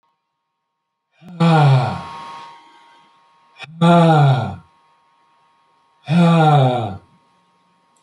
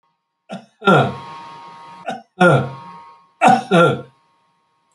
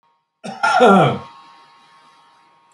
{
  "exhalation_length": "8.0 s",
  "exhalation_amplitude": 27706,
  "exhalation_signal_mean_std_ratio": 0.46,
  "three_cough_length": "4.9 s",
  "three_cough_amplitude": 27925,
  "three_cough_signal_mean_std_ratio": 0.41,
  "cough_length": "2.7 s",
  "cough_amplitude": 27995,
  "cough_signal_mean_std_ratio": 0.39,
  "survey_phase": "alpha (2021-03-01 to 2021-08-12)",
  "age": "65+",
  "gender": "Male",
  "wearing_mask": "No",
  "symptom_none": true,
  "smoker_status": "Ex-smoker",
  "respiratory_condition_asthma": false,
  "respiratory_condition_other": false,
  "recruitment_source": "REACT",
  "submission_delay": "1 day",
  "covid_test_result": "Negative",
  "covid_test_method": "RT-qPCR"
}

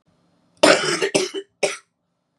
{
  "cough_length": "2.4 s",
  "cough_amplitude": 32711,
  "cough_signal_mean_std_ratio": 0.4,
  "survey_phase": "beta (2021-08-13 to 2022-03-07)",
  "age": "18-44",
  "gender": "Female",
  "wearing_mask": "No",
  "symptom_cough_any": true,
  "symptom_new_continuous_cough": true,
  "symptom_runny_or_blocked_nose": true,
  "symptom_shortness_of_breath": true,
  "symptom_sore_throat": true,
  "symptom_fatigue": true,
  "symptom_headache": true,
  "symptom_onset": "3 days",
  "smoker_status": "Never smoked",
  "respiratory_condition_asthma": true,
  "respiratory_condition_other": false,
  "recruitment_source": "Test and Trace",
  "submission_delay": "1 day",
  "covid_test_result": "Negative",
  "covid_test_method": "RT-qPCR"
}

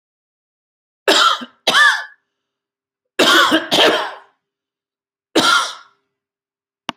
{
  "cough_length": "7.0 s",
  "cough_amplitude": 32768,
  "cough_signal_mean_std_ratio": 0.42,
  "survey_phase": "alpha (2021-03-01 to 2021-08-12)",
  "age": "45-64",
  "gender": "Male",
  "wearing_mask": "No",
  "symptom_cough_any": true,
  "symptom_headache": true,
  "symptom_onset": "12 days",
  "smoker_status": "Ex-smoker",
  "respiratory_condition_asthma": false,
  "respiratory_condition_other": false,
  "recruitment_source": "REACT",
  "submission_delay": "3 days",
  "covid_test_result": "Negative",
  "covid_test_method": "RT-qPCR"
}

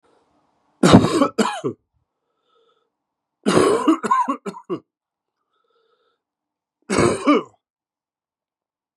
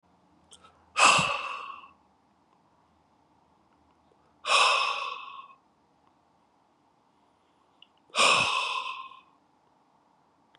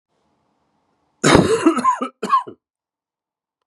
{
  "three_cough_length": "9.0 s",
  "three_cough_amplitude": 32768,
  "three_cough_signal_mean_std_ratio": 0.36,
  "exhalation_length": "10.6 s",
  "exhalation_amplitude": 15836,
  "exhalation_signal_mean_std_ratio": 0.34,
  "cough_length": "3.7 s",
  "cough_amplitude": 32768,
  "cough_signal_mean_std_ratio": 0.39,
  "survey_phase": "beta (2021-08-13 to 2022-03-07)",
  "age": "45-64",
  "gender": "Male",
  "wearing_mask": "No",
  "symptom_cough_any": true,
  "symptom_runny_or_blocked_nose": true,
  "symptom_sore_throat": true,
  "symptom_fatigue": true,
  "symptom_change_to_sense_of_smell_or_taste": true,
  "symptom_loss_of_taste": true,
  "symptom_onset": "2 days",
  "smoker_status": "Ex-smoker",
  "respiratory_condition_asthma": false,
  "respiratory_condition_other": false,
  "recruitment_source": "Test and Trace",
  "submission_delay": "1 day",
  "covid_test_result": "Positive",
  "covid_test_method": "LAMP"
}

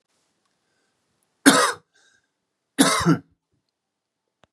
{
  "cough_length": "4.5 s",
  "cough_amplitude": 32767,
  "cough_signal_mean_std_ratio": 0.28,
  "survey_phase": "beta (2021-08-13 to 2022-03-07)",
  "age": "18-44",
  "gender": "Male",
  "wearing_mask": "No",
  "symptom_cough_any": true,
  "symptom_sore_throat": true,
  "symptom_headache": true,
  "symptom_onset": "2 days",
  "smoker_status": "Ex-smoker",
  "respiratory_condition_asthma": false,
  "respiratory_condition_other": false,
  "recruitment_source": "Test and Trace",
  "submission_delay": "0 days",
  "covid_test_result": "Positive",
  "covid_test_method": "RT-qPCR",
  "covid_ct_value": 21.9,
  "covid_ct_gene": "N gene"
}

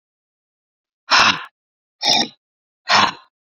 {
  "exhalation_length": "3.5 s",
  "exhalation_amplitude": 30320,
  "exhalation_signal_mean_std_ratio": 0.36,
  "survey_phase": "beta (2021-08-13 to 2022-03-07)",
  "age": "18-44",
  "gender": "Female",
  "wearing_mask": "Yes",
  "symptom_none": true,
  "smoker_status": "Current smoker (e-cigarettes or vapes only)",
  "respiratory_condition_asthma": false,
  "respiratory_condition_other": false,
  "recruitment_source": "REACT",
  "submission_delay": "2 days",
  "covid_test_result": "Negative",
  "covid_test_method": "RT-qPCR"
}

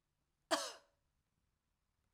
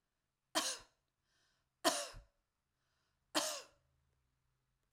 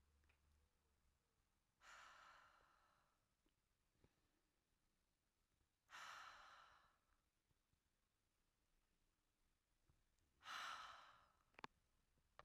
{
  "cough_length": "2.1 s",
  "cough_amplitude": 3034,
  "cough_signal_mean_std_ratio": 0.22,
  "three_cough_length": "4.9 s",
  "three_cough_amplitude": 3922,
  "three_cough_signal_mean_std_ratio": 0.28,
  "exhalation_length": "12.4 s",
  "exhalation_amplitude": 572,
  "exhalation_signal_mean_std_ratio": 0.37,
  "survey_phase": "alpha (2021-03-01 to 2021-08-12)",
  "age": "45-64",
  "gender": "Female",
  "wearing_mask": "No",
  "symptom_none": true,
  "smoker_status": "Ex-smoker",
  "respiratory_condition_asthma": false,
  "respiratory_condition_other": false,
  "recruitment_source": "REACT",
  "submission_delay": "2 days",
  "covid_test_result": "Negative",
  "covid_test_method": "RT-qPCR"
}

